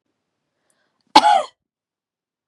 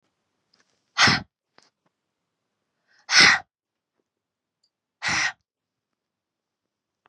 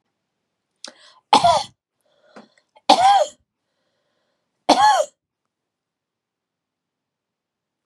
cough_length: 2.5 s
cough_amplitude: 32768
cough_signal_mean_std_ratio: 0.24
exhalation_length: 7.1 s
exhalation_amplitude: 25526
exhalation_signal_mean_std_ratio: 0.24
three_cough_length: 7.9 s
three_cough_amplitude: 32767
three_cough_signal_mean_std_ratio: 0.29
survey_phase: beta (2021-08-13 to 2022-03-07)
age: 18-44
gender: Female
wearing_mask: 'No'
symptom_none: true
smoker_status: Never smoked
respiratory_condition_asthma: true
respiratory_condition_other: false
recruitment_source: REACT
submission_delay: 17 days
covid_test_result: Negative
covid_test_method: RT-qPCR
influenza_a_test_result: Negative
influenza_b_test_result: Negative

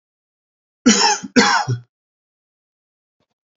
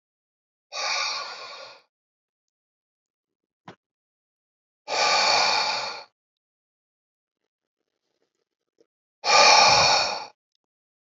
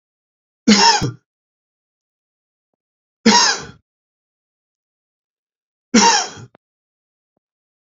cough_length: 3.6 s
cough_amplitude: 29808
cough_signal_mean_std_ratio: 0.35
exhalation_length: 11.2 s
exhalation_amplitude: 24734
exhalation_signal_mean_std_ratio: 0.36
three_cough_length: 7.9 s
three_cough_amplitude: 32728
three_cough_signal_mean_std_ratio: 0.29
survey_phase: beta (2021-08-13 to 2022-03-07)
age: 45-64
gender: Male
wearing_mask: 'No'
symptom_runny_or_blocked_nose: true
symptom_fatigue: true
symptom_other: true
smoker_status: Ex-smoker
respiratory_condition_asthma: false
respiratory_condition_other: false
recruitment_source: Test and Trace
submission_delay: 1 day
covid_test_result: Positive
covid_test_method: LFT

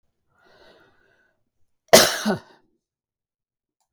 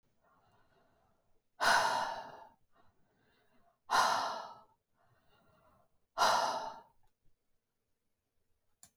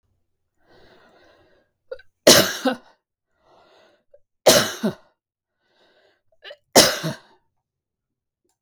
cough_length: 3.9 s
cough_amplitude: 32768
cough_signal_mean_std_ratio: 0.2
exhalation_length: 9.0 s
exhalation_amplitude: 5407
exhalation_signal_mean_std_ratio: 0.35
three_cough_length: 8.6 s
three_cough_amplitude: 32768
three_cough_signal_mean_std_ratio: 0.25
survey_phase: beta (2021-08-13 to 2022-03-07)
age: 65+
gender: Female
wearing_mask: 'No'
symptom_none: true
smoker_status: Never smoked
respiratory_condition_asthma: false
respiratory_condition_other: false
recruitment_source: REACT
submission_delay: 3 days
covid_test_result: Negative
covid_test_method: RT-qPCR
influenza_a_test_result: Negative
influenza_b_test_result: Negative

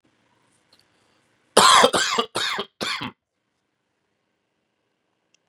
cough_length: 5.5 s
cough_amplitude: 32767
cough_signal_mean_std_ratio: 0.3
survey_phase: beta (2021-08-13 to 2022-03-07)
age: 18-44
gender: Male
wearing_mask: 'No'
symptom_cough_any: true
symptom_sore_throat: true
symptom_fatigue: true
symptom_headache: true
smoker_status: Never smoked
respiratory_condition_asthma: false
respiratory_condition_other: false
recruitment_source: Test and Trace
submission_delay: 2 days
covid_test_result: Positive
covid_test_method: LFT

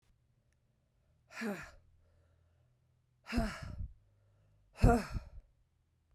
exhalation_length: 6.1 s
exhalation_amplitude: 7031
exhalation_signal_mean_std_ratio: 0.27
survey_phase: beta (2021-08-13 to 2022-03-07)
age: 45-64
gender: Female
wearing_mask: 'No'
symptom_cough_any: true
symptom_runny_or_blocked_nose: true
symptom_sore_throat: true
symptom_fatigue: true
symptom_fever_high_temperature: true
symptom_headache: true
symptom_other: true
symptom_onset: 3 days
smoker_status: Never smoked
respiratory_condition_asthma: false
respiratory_condition_other: false
recruitment_source: Test and Trace
submission_delay: 2 days
covid_test_result: Positive
covid_test_method: ePCR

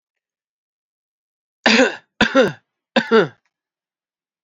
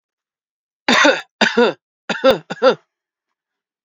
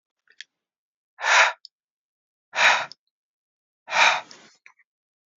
three_cough_length: 4.4 s
three_cough_amplitude: 28361
three_cough_signal_mean_std_ratio: 0.32
cough_length: 3.8 s
cough_amplitude: 30877
cough_signal_mean_std_ratio: 0.39
exhalation_length: 5.4 s
exhalation_amplitude: 23927
exhalation_signal_mean_std_ratio: 0.31
survey_phase: alpha (2021-03-01 to 2021-08-12)
age: 18-44
gender: Male
wearing_mask: 'No'
symptom_change_to_sense_of_smell_or_taste: true
smoker_status: Never smoked
respiratory_condition_asthma: false
respiratory_condition_other: false
recruitment_source: Test and Trace
submission_delay: 2 days
covid_test_result: Positive
covid_test_method: RT-qPCR
covid_ct_value: 17.6
covid_ct_gene: ORF1ab gene
covid_ct_mean: 18.1
covid_viral_load: 1100000 copies/ml
covid_viral_load_category: High viral load (>1M copies/ml)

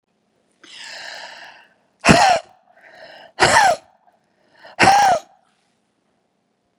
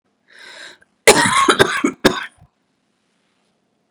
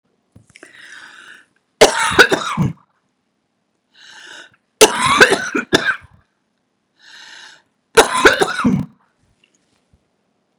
exhalation_length: 6.8 s
exhalation_amplitude: 32768
exhalation_signal_mean_std_ratio: 0.35
cough_length: 3.9 s
cough_amplitude: 32768
cough_signal_mean_std_ratio: 0.35
three_cough_length: 10.6 s
three_cough_amplitude: 32768
three_cough_signal_mean_std_ratio: 0.34
survey_phase: beta (2021-08-13 to 2022-03-07)
age: 45-64
gender: Female
wearing_mask: 'No'
symptom_runny_or_blocked_nose: true
symptom_other: true
smoker_status: Ex-smoker
respiratory_condition_asthma: false
respiratory_condition_other: false
recruitment_source: Test and Trace
submission_delay: 2 days
covid_test_result: Positive
covid_test_method: LFT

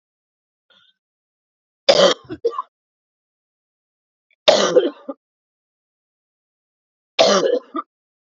three_cough_length: 8.4 s
three_cough_amplitude: 32768
three_cough_signal_mean_std_ratio: 0.3
survey_phase: alpha (2021-03-01 to 2021-08-12)
age: 45-64
gender: Female
wearing_mask: 'No'
symptom_cough_any: true
symptom_new_continuous_cough: true
symptom_fatigue: true
symptom_fever_high_temperature: true
symptom_headache: true
symptom_onset: 2 days
smoker_status: Never smoked
respiratory_condition_asthma: false
respiratory_condition_other: false
recruitment_source: Test and Trace
submission_delay: 2 days
covid_test_result: Positive
covid_test_method: RT-qPCR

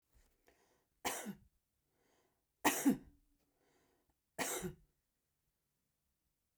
three_cough_length: 6.6 s
three_cough_amplitude: 4727
three_cough_signal_mean_std_ratio: 0.26
survey_phase: beta (2021-08-13 to 2022-03-07)
age: 65+
gender: Female
wearing_mask: 'No'
symptom_cough_any: true
symptom_fatigue: true
smoker_status: Ex-smoker
respiratory_condition_asthma: true
respiratory_condition_other: false
recruitment_source: Test and Trace
submission_delay: 2 days
covid_test_result: Positive
covid_test_method: RT-qPCR
covid_ct_value: 25.2
covid_ct_gene: ORF1ab gene
covid_ct_mean: 25.7
covid_viral_load: 3800 copies/ml
covid_viral_load_category: Minimal viral load (< 10K copies/ml)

